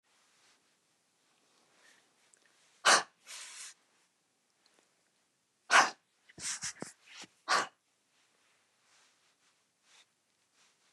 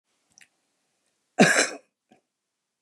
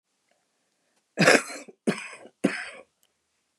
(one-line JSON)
{"exhalation_length": "10.9 s", "exhalation_amplitude": 9846, "exhalation_signal_mean_std_ratio": 0.2, "cough_length": "2.8 s", "cough_amplitude": 19734, "cough_signal_mean_std_ratio": 0.24, "three_cough_length": "3.6 s", "three_cough_amplitude": 25656, "three_cough_signal_mean_std_ratio": 0.28, "survey_phase": "beta (2021-08-13 to 2022-03-07)", "age": "65+", "gender": "Female", "wearing_mask": "No", "symptom_cough_any": true, "symptom_shortness_of_breath": true, "symptom_onset": "12 days", "smoker_status": "Ex-smoker", "respiratory_condition_asthma": true, "respiratory_condition_other": false, "recruitment_source": "REACT", "submission_delay": "1 day", "covid_test_result": "Negative", "covid_test_method": "RT-qPCR", "influenza_a_test_result": "Negative", "influenza_b_test_result": "Negative"}